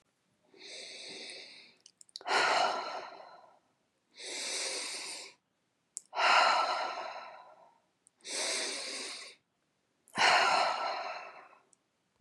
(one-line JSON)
{"exhalation_length": "12.2 s", "exhalation_amplitude": 8543, "exhalation_signal_mean_std_ratio": 0.49, "survey_phase": "beta (2021-08-13 to 2022-03-07)", "age": "65+", "gender": "Female", "wearing_mask": "No", "symptom_cough_any": true, "smoker_status": "Ex-smoker", "respiratory_condition_asthma": false, "respiratory_condition_other": false, "recruitment_source": "REACT", "submission_delay": "4 days", "covid_test_result": "Negative", "covid_test_method": "RT-qPCR", "influenza_a_test_result": "Negative", "influenza_b_test_result": "Negative"}